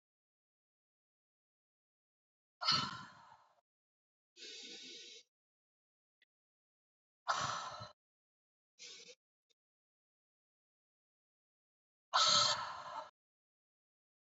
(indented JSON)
{
  "exhalation_length": "14.3 s",
  "exhalation_amplitude": 4120,
  "exhalation_signal_mean_std_ratio": 0.26,
  "survey_phase": "beta (2021-08-13 to 2022-03-07)",
  "age": "18-44",
  "gender": "Female",
  "wearing_mask": "No",
  "symptom_cough_any": true,
  "symptom_runny_or_blocked_nose": true,
  "symptom_fatigue": true,
  "symptom_headache": true,
  "symptom_onset": "5 days",
  "smoker_status": "Never smoked",
  "respiratory_condition_asthma": false,
  "respiratory_condition_other": false,
  "recruitment_source": "Test and Trace",
  "submission_delay": "1 day",
  "covid_test_result": "Positive",
  "covid_test_method": "ePCR"
}